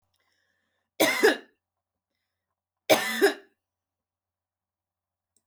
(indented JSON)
{
  "cough_length": "5.5 s",
  "cough_amplitude": 18543,
  "cough_signal_mean_std_ratio": 0.27,
  "survey_phase": "alpha (2021-03-01 to 2021-08-12)",
  "age": "45-64",
  "gender": "Female",
  "wearing_mask": "No",
  "symptom_none": true,
  "symptom_fatigue": true,
  "smoker_status": "Never smoked",
  "respiratory_condition_asthma": true,
  "respiratory_condition_other": false,
  "recruitment_source": "REACT",
  "submission_delay": "2 days",
  "covid_test_result": "Negative",
  "covid_test_method": "RT-qPCR"
}